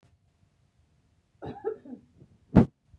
{
  "cough_length": "3.0 s",
  "cough_amplitude": 21042,
  "cough_signal_mean_std_ratio": 0.2,
  "survey_phase": "beta (2021-08-13 to 2022-03-07)",
  "age": "45-64",
  "gender": "Female",
  "wearing_mask": "No",
  "symptom_none": true,
  "symptom_onset": "6 days",
  "smoker_status": "Ex-smoker",
  "respiratory_condition_asthma": false,
  "respiratory_condition_other": false,
  "recruitment_source": "REACT",
  "submission_delay": "4 days",
  "covid_test_result": "Negative",
  "covid_test_method": "RT-qPCR",
  "influenza_a_test_result": "Negative",
  "influenza_b_test_result": "Negative"
}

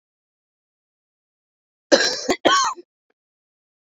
{
  "cough_length": "3.9 s",
  "cough_amplitude": 28570,
  "cough_signal_mean_std_ratio": 0.3,
  "survey_phase": "beta (2021-08-13 to 2022-03-07)",
  "age": "45-64",
  "gender": "Female",
  "wearing_mask": "No",
  "symptom_cough_any": true,
  "symptom_runny_or_blocked_nose": true,
  "symptom_sore_throat": true,
  "symptom_fatigue": true,
  "symptom_fever_high_temperature": true,
  "symptom_headache": true,
  "symptom_change_to_sense_of_smell_or_taste": true,
  "symptom_loss_of_taste": true,
  "symptom_onset": "4 days",
  "smoker_status": "Ex-smoker",
  "respiratory_condition_asthma": false,
  "respiratory_condition_other": false,
  "recruitment_source": "Test and Trace",
  "submission_delay": "2 days",
  "covid_test_result": "Positive",
  "covid_test_method": "RT-qPCR",
  "covid_ct_value": 20.7,
  "covid_ct_gene": "ORF1ab gene"
}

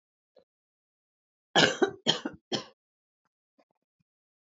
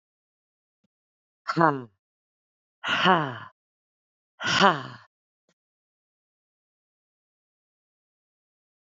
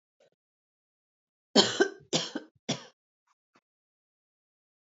{
  "cough_length": "4.5 s",
  "cough_amplitude": 16898,
  "cough_signal_mean_std_ratio": 0.24,
  "exhalation_length": "9.0 s",
  "exhalation_amplitude": 23396,
  "exhalation_signal_mean_std_ratio": 0.23,
  "three_cough_length": "4.9 s",
  "three_cough_amplitude": 15566,
  "three_cough_signal_mean_std_ratio": 0.23,
  "survey_phase": "alpha (2021-03-01 to 2021-08-12)",
  "age": "18-44",
  "gender": "Female",
  "wearing_mask": "No",
  "symptom_cough_any": true,
  "symptom_fatigue": true,
  "smoker_status": "Current smoker (11 or more cigarettes per day)",
  "respiratory_condition_asthma": false,
  "respiratory_condition_other": false,
  "recruitment_source": "Test and Trace",
  "submission_delay": "2 days",
  "covid_test_result": "Positive",
  "covid_test_method": "RT-qPCR"
}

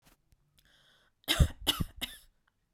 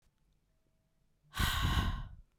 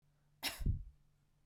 {
  "three_cough_length": "2.7 s",
  "three_cough_amplitude": 9526,
  "three_cough_signal_mean_std_ratio": 0.28,
  "exhalation_length": "2.4 s",
  "exhalation_amplitude": 4002,
  "exhalation_signal_mean_std_ratio": 0.47,
  "cough_length": "1.5 s",
  "cough_amplitude": 1828,
  "cough_signal_mean_std_ratio": 0.4,
  "survey_phase": "beta (2021-08-13 to 2022-03-07)",
  "age": "18-44",
  "gender": "Female",
  "wearing_mask": "No",
  "symptom_none": true,
  "smoker_status": "Never smoked",
  "respiratory_condition_asthma": false,
  "respiratory_condition_other": false,
  "recruitment_source": "REACT",
  "submission_delay": "1 day",
  "covid_test_result": "Negative",
  "covid_test_method": "RT-qPCR"
}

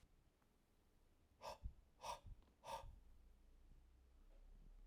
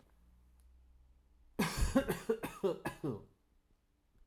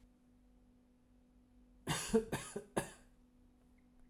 {
  "exhalation_length": "4.9 s",
  "exhalation_amplitude": 375,
  "exhalation_signal_mean_std_ratio": 0.58,
  "cough_length": "4.3 s",
  "cough_amplitude": 5377,
  "cough_signal_mean_std_ratio": 0.42,
  "three_cough_length": "4.1 s",
  "three_cough_amplitude": 3724,
  "three_cough_signal_mean_std_ratio": 0.33,
  "survey_phase": "alpha (2021-03-01 to 2021-08-12)",
  "age": "45-64",
  "gender": "Male",
  "wearing_mask": "No",
  "symptom_none": true,
  "smoker_status": "Never smoked",
  "respiratory_condition_asthma": false,
  "respiratory_condition_other": false,
  "recruitment_source": "REACT",
  "submission_delay": "1 day",
  "covid_test_result": "Negative",
  "covid_test_method": "RT-qPCR"
}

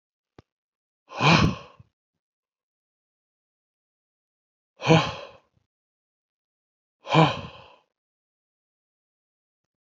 {
  "exhalation_length": "10.0 s",
  "exhalation_amplitude": 23791,
  "exhalation_signal_mean_std_ratio": 0.23,
  "survey_phase": "beta (2021-08-13 to 2022-03-07)",
  "age": "65+",
  "gender": "Male",
  "wearing_mask": "No",
  "symptom_none": true,
  "smoker_status": "Never smoked",
  "respiratory_condition_asthma": false,
  "respiratory_condition_other": false,
  "recruitment_source": "REACT",
  "submission_delay": "7 days",
  "covid_test_result": "Negative",
  "covid_test_method": "RT-qPCR",
  "influenza_a_test_result": "Negative",
  "influenza_b_test_result": "Negative"
}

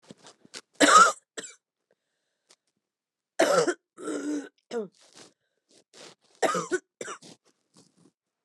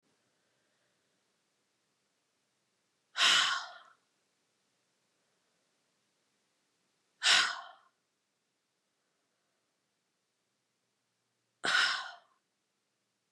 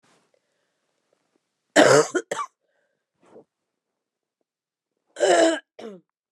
{
  "three_cough_length": "8.4 s",
  "three_cough_amplitude": 20582,
  "three_cough_signal_mean_std_ratio": 0.3,
  "exhalation_length": "13.3 s",
  "exhalation_amplitude": 8493,
  "exhalation_signal_mean_std_ratio": 0.23,
  "cough_length": "6.3 s",
  "cough_amplitude": 29204,
  "cough_signal_mean_std_ratio": 0.29,
  "survey_phase": "beta (2021-08-13 to 2022-03-07)",
  "age": "45-64",
  "gender": "Female",
  "wearing_mask": "No",
  "symptom_cough_any": true,
  "symptom_runny_or_blocked_nose": true,
  "symptom_sore_throat": true,
  "symptom_diarrhoea": true,
  "symptom_fatigue": true,
  "symptom_onset": "2 days",
  "smoker_status": "Never smoked",
  "respiratory_condition_asthma": false,
  "respiratory_condition_other": false,
  "recruitment_source": "Test and Trace",
  "submission_delay": "2 days",
  "covid_test_result": "Positive",
  "covid_test_method": "RT-qPCR",
  "covid_ct_value": 18.4,
  "covid_ct_gene": "N gene"
}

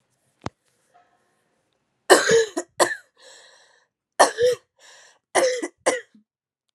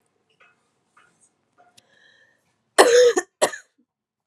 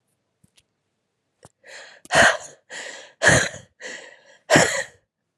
{
  "three_cough_length": "6.7 s",
  "three_cough_amplitude": 32562,
  "three_cough_signal_mean_std_ratio": 0.33,
  "cough_length": "4.3 s",
  "cough_amplitude": 32693,
  "cough_signal_mean_std_ratio": 0.27,
  "exhalation_length": "5.4 s",
  "exhalation_amplitude": 31788,
  "exhalation_signal_mean_std_ratio": 0.33,
  "survey_phase": "alpha (2021-03-01 to 2021-08-12)",
  "age": "18-44",
  "gender": "Female",
  "wearing_mask": "No",
  "symptom_cough_any": true,
  "symptom_shortness_of_breath": true,
  "symptom_fatigue": true,
  "symptom_onset": "3 days",
  "smoker_status": "Ex-smoker",
  "respiratory_condition_asthma": true,
  "respiratory_condition_other": false,
  "recruitment_source": "Test and Trace",
  "submission_delay": "1 day",
  "covid_test_result": "Positive",
  "covid_test_method": "RT-qPCR",
  "covid_ct_value": 32.5,
  "covid_ct_gene": "N gene"
}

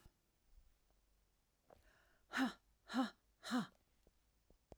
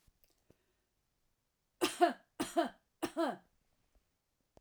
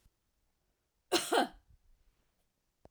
{
  "exhalation_length": "4.8 s",
  "exhalation_amplitude": 1242,
  "exhalation_signal_mean_std_ratio": 0.31,
  "three_cough_length": "4.6 s",
  "three_cough_amplitude": 5920,
  "three_cough_signal_mean_std_ratio": 0.28,
  "cough_length": "2.9 s",
  "cough_amplitude": 5562,
  "cough_signal_mean_std_ratio": 0.26,
  "survey_phase": "alpha (2021-03-01 to 2021-08-12)",
  "age": "45-64",
  "gender": "Female",
  "wearing_mask": "No",
  "symptom_fatigue": true,
  "symptom_headache": true,
  "smoker_status": "Ex-smoker",
  "respiratory_condition_asthma": false,
  "respiratory_condition_other": false,
  "recruitment_source": "REACT",
  "submission_delay": "3 days",
  "covid_test_result": "Negative",
  "covid_test_method": "RT-qPCR"
}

